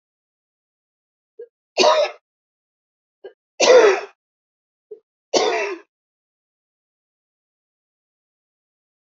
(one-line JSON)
{"three_cough_length": "9.0 s", "three_cough_amplitude": 30596, "three_cough_signal_mean_std_ratio": 0.27, "survey_phase": "alpha (2021-03-01 to 2021-08-12)", "age": "45-64", "gender": "Female", "wearing_mask": "No", "symptom_none": true, "smoker_status": "Ex-smoker", "respiratory_condition_asthma": false, "respiratory_condition_other": false, "recruitment_source": "REACT", "submission_delay": "2 days", "covid_test_result": "Negative", "covid_test_method": "RT-qPCR"}